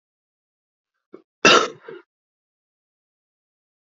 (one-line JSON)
{"cough_length": "3.8 s", "cough_amplitude": 28618, "cough_signal_mean_std_ratio": 0.19, "survey_phase": "beta (2021-08-13 to 2022-03-07)", "age": "45-64", "gender": "Male", "wearing_mask": "No", "symptom_cough_any": true, "symptom_runny_or_blocked_nose": true, "symptom_shortness_of_breath": true, "symptom_sore_throat": true, "symptom_fatigue": true, "symptom_fever_high_temperature": true, "symptom_headache": true, "symptom_other": true, "symptom_onset": "2 days", "smoker_status": "Never smoked", "respiratory_condition_asthma": false, "respiratory_condition_other": false, "recruitment_source": "Test and Trace", "submission_delay": "1 day", "covid_test_result": "Positive", "covid_test_method": "RT-qPCR", "covid_ct_value": 21.6, "covid_ct_gene": "N gene", "covid_ct_mean": 22.2, "covid_viral_load": "51000 copies/ml", "covid_viral_load_category": "Low viral load (10K-1M copies/ml)"}